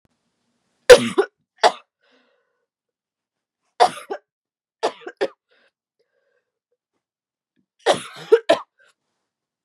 three_cough_length: 9.6 s
three_cough_amplitude: 32768
three_cough_signal_mean_std_ratio: 0.2
survey_phase: beta (2021-08-13 to 2022-03-07)
age: 18-44
gender: Female
wearing_mask: 'No'
symptom_cough_any: true
symptom_runny_or_blocked_nose: true
symptom_sore_throat: true
symptom_headache: true
symptom_onset: 3 days
smoker_status: Never smoked
respiratory_condition_asthma: false
respiratory_condition_other: false
recruitment_source: Test and Trace
submission_delay: 2 days
covid_test_result: Positive
covid_test_method: RT-qPCR
covid_ct_value: 24.1
covid_ct_gene: ORF1ab gene
covid_ct_mean: 24.4
covid_viral_load: 10000 copies/ml
covid_viral_load_category: Low viral load (10K-1M copies/ml)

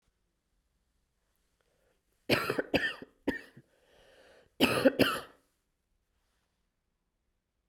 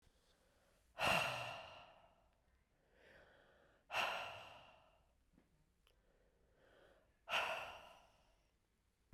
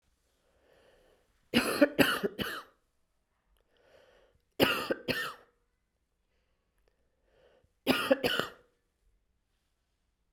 cough_length: 7.7 s
cough_amplitude: 11399
cough_signal_mean_std_ratio: 0.28
exhalation_length: 9.1 s
exhalation_amplitude: 2456
exhalation_signal_mean_std_ratio: 0.35
three_cough_length: 10.3 s
three_cough_amplitude: 13164
three_cough_signal_mean_std_ratio: 0.3
survey_phase: beta (2021-08-13 to 2022-03-07)
age: 45-64
gender: Female
wearing_mask: 'Yes'
symptom_runny_or_blocked_nose: true
symptom_sore_throat: true
symptom_headache: true
symptom_onset: 3 days
smoker_status: Never smoked
respiratory_condition_asthma: false
respiratory_condition_other: false
recruitment_source: Test and Trace
submission_delay: 1 day
covid_test_result: Positive
covid_test_method: RT-qPCR
covid_ct_value: 17.8
covid_ct_gene: ORF1ab gene
covid_ct_mean: 18.0
covid_viral_load: 1200000 copies/ml
covid_viral_load_category: High viral load (>1M copies/ml)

